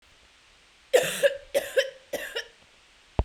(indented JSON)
{
  "three_cough_length": "3.2 s",
  "three_cough_amplitude": 15214,
  "three_cough_signal_mean_std_ratio": 0.38,
  "survey_phase": "beta (2021-08-13 to 2022-03-07)",
  "age": "18-44",
  "gender": "Female",
  "wearing_mask": "No",
  "symptom_cough_any": true,
  "symptom_runny_or_blocked_nose": true,
  "symptom_shortness_of_breath": true,
  "symptom_change_to_sense_of_smell_or_taste": true,
  "symptom_loss_of_taste": true,
  "symptom_other": true,
  "symptom_onset": "8 days",
  "smoker_status": "Prefer not to say",
  "respiratory_condition_asthma": false,
  "respiratory_condition_other": false,
  "recruitment_source": "REACT",
  "submission_delay": "1 day",
  "covid_test_result": "Positive",
  "covid_test_method": "RT-qPCR",
  "covid_ct_value": 31.0,
  "covid_ct_gene": "N gene"
}